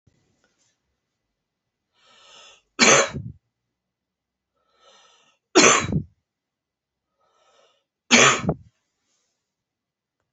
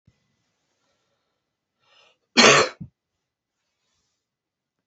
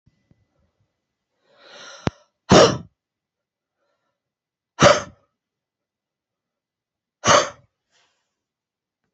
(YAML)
three_cough_length: 10.3 s
three_cough_amplitude: 27533
three_cough_signal_mean_std_ratio: 0.25
cough_length: 4.9 s
cough_amplitude: 27218
cough_signal_mean_std_ratio: 0.2
exhalation_length: 9.1 s
exhalation_amplitude: 31670
exhalation_signal_mean_std_ratio: 0.21
survey_phase: alpha (2021-03-01 to 2021-08-12)
age: 45-64
gender: Female
wearing_mask: 'No'
symptom_cough_any: true
symptom_headache: true
symptom_change_to_sense_of_smell_or_taste: true
symptom_onset: 10 days
smoker_status: Never smoked
respiratory_condition_asthma: false
respiratory_condition_other: false
recruitment_source: Test and Trace
submission_delay: 2 days
covid_test_result: Positive
covid_test_method: RT-qPCR
covid_ct_value: 34.3
covid_ct_gene: ORF1ab gene